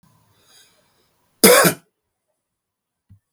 {"cough_length": "3.3 s", "cough_amplitude": 32767, "cough_signal_mean_std_ratio": 0.24, "survey_phase": "beta (2021-08-13 to 2022-03-07)", "age": "45-64", "gender": "Male", "wearing_mask": "No", "symptom_cough_any": true, "symptom_runny_or_blocked_nose": true, "symptom_sore_throat": true, "symptom_headache": true, "smoker_status": "Never smoked", "respiratory_condition_asthma": false, "respiratory_condition_other": false, "recruitment_source": "Test and Trace", "submission_delay": "1 day", "covid_test_result": "Positive", "covid_test_method": "ePCR"}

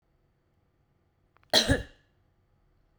{"cough_length": "3.0 s", "cough_amplitude": 17977, "cough_signal_mean_std_ratio": 0.23, "survey_phase": "beta (2021-08-13 to 2022-03-07)", "age": "18-44", "gender": "Female", "wearing_mask": "No", "symptom_none": true, "smoker_status": "Current smoker (1 to 10 cigarettes per day)", "respiratory_condition_asthma": false, "respiratory_condition_other": false, "recruitment_source": "REACT", "submission_delay": "1 day", "covid_test_result": "Negative", "covid_test_method": "RT-qPCR"}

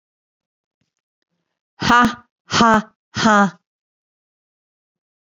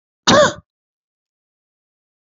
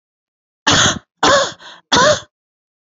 {"exhalation_length": "5.4 s", "exhalation_amplitude": 28411, "exhalation_signal_mean_std_ratio": 0.31, "cough_length": "2.2 s", "cough_amplitude": 31403, "cough_signal_mean_std_ratio": 0.27, "three_cough_length": "3.0 s", "three_cough_amplitude": 32768, "three_cough_signal_mean_std_ratio": 0.45, "survey_phase": "beta (2021-08-13 to 2022-03-07)", "age": "45-64", "gender": "Female", "wearing_mask": "No", "symptom_none": true, "smoker_status": "Never smoked", "respiratory_condition_asthma": false, "respiratory_condition_other": false, "recruitment_source": "REACT", "submission_delay": "2 days", "covid_test_result": "Negative", "covid_test_method": "RT-qPCR", "influenza_a_test_result": "Negative", "influenza_b_test_result": "Negative"}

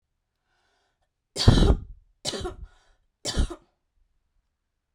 {"three_cough_length": "4.9 s", "three_cough_amplitude": 24243, "three_cough_signal_mean_std_ratio": 0.29, "survey_phase": "beta (2021-08-13 to 2022-03-07)", "age": "18-44", "gender": "Female", "wearing_mask": "No", "symptom_runny_or_blocked_nose": true, "symptom_onset": "3 days", "smoker_status": "Never smoked", "respiratory_condition_asthma": false, "respiratory_condition_other": false, "recruitment_source": "REACT", "submission_delay": "1 day", "covid_test_result": "Negative", "covid_test_method": "RT-qPCR", "influenza_a_test_result": "Negative", "influenza_b_test_result": "Negative"}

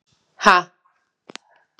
{"exhalation_length": "1.8 s", "exhalation_amplitude": 32768, "exhalation_signal_mean_std_ratio": 0.23, "survey_phase": "beta (2021-08-13 to 2022-03-07)", "age": "18-44", "gender": "Female", "wearing_mask": "No", "symptom_new_continuous_cough": true, "symptom_runny_or_blocked_nose": true, "symptom_shortness_of_breath": true, "symptom_sore_throat": true, "symptom_headache": true, "symptom_change_to_sense_of_smell_or_taste": true, "symptom_other": true, "symptom_onset": "5 days", "smoker_status": "Current smoker (e-cigarettes or vapes only)", "respiratory_condition_asthma": false, "respiratory_condition_other": false, "recruitment_source": "Test and Trace", "submission_delay": "2 days", "covid_test_result": "Positive", "covid_test_method": "RT-qPCR", "covid_ct_value": 17.0, "covid_ct_gene": "ORF1ab gene", "covid_ct_mean": 17.3, "covid_viral_load": "2100000 copies/ml", "covid_viral_load_category": "High viral load (>1M copies/ml)"}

